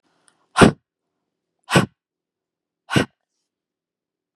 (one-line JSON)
{"exhalation_length": "4.4 s", "exhalation_amplitude": 32768, "exhalation_signal_mean_std_ratio": 0.21, "survey_phase": "beta (2021-08-13 to 2022-03-07)", "age": "45-64", "gender": "Female", "wearing_mask": "No", "symptom_none": true, "smoker_status": "Never smoked", "respiratory_condition_asthma": false, "respiratory_condition_other": false, "recruitment_source": "REACT", "submission_delay": "4 days", "covid_test_result": "Negative", "covid_test_method": "RT-qPCR", "influenza_a_test_result": "Negative", "influenza_b_test_result": "Negative"}